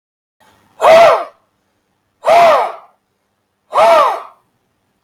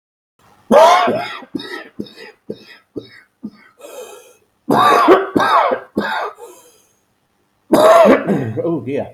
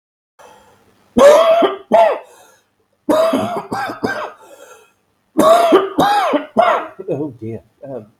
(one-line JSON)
{"exhalation_length": "5.0 s", "exhalation_amplitude": 32762, "exhalation_signal_mean_std_ratio": 0.46, "cough_length": "9.1 s", "cough_amplitude": 32766, "cough_signal_mean_std_ratio": 0.49, "three_cough_length": "8.2 s", "three_cough_amplitude": 32766, "three_cough_signal_mean_std_ratio": 0.54, "survey_phase": "beta (2021-08-13 to 2022-03-07)", "age": "65+", "gender": "Male", "wearing_mask": "No", "symptom_cough_any": true, "symptom_new_continuous_cough": true, "symptom_runny_or_blocked_nose": true, "symptom_abdominal_pain": true, "symptom_diarrhoea": true, "symptom_fatigue": true, "symptom_change_to_sense_of_smell_or_taste": true, "symptom_loss_of_taste": true, "symptom_onset": "4 days", "smoker_status": "Ex-smoker", "respiratory_condition_asthma": false, "respiratory_condition_other": false, "recruitment_source": "Test and Trace", "submission_delay": "3 days", "covid_test_result": "Positive", "covid_test_method": "RT-qPCR", "covid_ct_value": 18.8, "covid_ct_gene": "ORF1ab gene", "covid_ct_mean": 19.6, "covid_viral_load": "360000 copies/ml", "covid_viral_load_category": "Low viral load (10K-1M copies/ml)"}